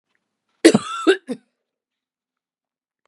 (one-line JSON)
{"cough_length": "3.1 s", "cough_amplitude": 32768, "cough_signal_mean_std_ratio": 0.24, "survey_phase": "beta (2021-08-13 to 2022-03-07)", "age": "45-64", "gender": "Female", "wearing_mask": "No", "symptom_cough_any": true, "symptom_runny_or_blocked_nose": true, "symptom_fatigue": true, "symptom_onset": "3 days", "smoker_status": "Ex-smoker", "respiratory_condition_asthma": false, "respiratory_condition_other": false, "recruitment_source": "Test and Trace", "submission_delay": "2 days", "covid_test_result": "Positive", "covid_test_method": "RT-qPCR"}